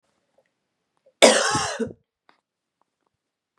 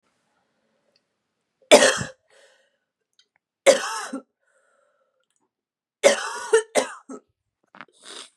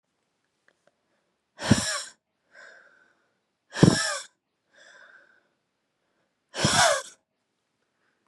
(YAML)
cough_length: 3.6 s
cough_amplitude: 32767
cough_signal_mean_std_ratio: 0.27
three_cough_length: 8.4 s
three_cough_amplitude: 32767
three_cough_signal_mean_std_ratio: 0.26
exhalation_length: 8.3 s
exhalation_amplitude: 27055
exhalation_signal_mean_std_ratio: 0.26
survey_phase: beta (2021-08-13 to 2022-03-07)
age: 18-44
gender: Female
wearing_mask: 'No'
symptom_cough_any: true
symptom_runny_or_blocked_nose: true
symptom_sore_throat: true
symptom_fatigue: true
symptom_headache: true
symptom_other: true
symptom_onset: 3 days
smoker_status: Never smoked
respiratory_condition_asthma: false
respiratory_condition_other: false
recruitment_source: Test and Trace
submission_delay: 1 day
covid_test_result: Positive
covid_test_method: RT-qPCR
covid_ct_value: 14.1
covid_ct_gene: ORF1ab gene
covid_ct_mean: 14.3
covid_viral_load: 21000000 copies/ml
covid_viral_load_category: High viral load (>1M copies/ml)